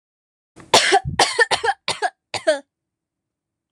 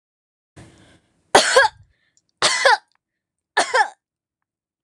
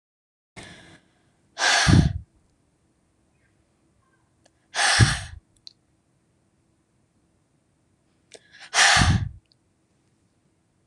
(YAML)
cough_length: 3.7 s
cough_amplitude: 26028
cough_signal_mean_std_ratio: 0.4
three_cough_length: 4.8 s
three_cough_amplitude: 26028
three_cough_signal_mean_std_ratio: 0.33
exhalation_length: 10.9 s
exhalation_amplitude: 25086
exhalation_signal_mean_std_ratio: 0.3
survey_phase: alpha (2021-03-01 to 2021-08-12)
age: 18-44
gender: Female
wearing_mask: 'No'
symptom_abdominal_pain: true
smoker_status: Never smoked
respiratory_condition_asthma: true
respiratory_condition_other: false
recruitment_source: REACT
submission_delay: 1 day
covid_test_result: Negative
covid_test_method: RT-qPCR